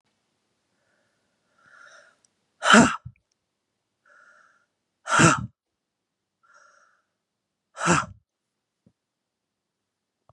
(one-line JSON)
{"exhalation_length": "10.3 s", "exhalation_amplitude": 28428, "exhalation_signal_mean_std_ratio": 0.21, "survey_phase": "beta (2021-08-13 to 2022-03-07)", "age": "45-64", "gender": "Female", "wearing_mask": "No", "symptom_runny_or_blocked_nose": true, "symptom_fatigue": true, "symptom_other": true, "symptom_onset": "3 days", "smoker_status": "Ex-smoker", "respiratory_condition_asthma": false, "respiratory_condition_other": false, "recruitment_source": "Test and Trace", "submission_delay": "2 days", "covid_test_result": "Positive", "covid_test_method": "RT-qPCR", "covid_ct_value": 21.3, "covid_ct_gene": "N gene", "covid_ct_mean": 21.6, "covid_viral_load": "80000 copies/ml", "covid_viral_load_category": "Low viral load (10K-1M copies/ml)"}